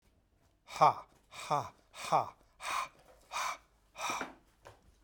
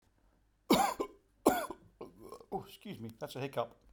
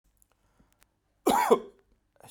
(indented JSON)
{
  "exhalation_length": "5.0 s",
  "exhalation_amplitude": 8411,
  "exhalation_signal_mean_std_ratio": 0.36,
  "three_cough_length": "3.9 s",
  "three_cough_amplitude": 8147,
  "three_cough_signal_mean_std_ratio": 0.39,
  "cough_length": "2.3 s",
  "cough_amplitude": 12738,
  "cough_signal_mean_std_ratio": 0.3,
  "survey_phase": "beta (2021-08-13 to 2022-03-07)",
  "age": "45-64",
  "gender": "Male",
  "wearing_mask": "No",
  "symptom_none": true,
  "smoker_status": "Never smoked",
  "respiratory_condition_asthma": false,
  "respiratory_condition_other": false,
  "recruitment_source": "Test and Trace",
  "submission_delay": "2 days",
  "covid_test_result": "Positive",
  "covid_test_method": "LAMP"
}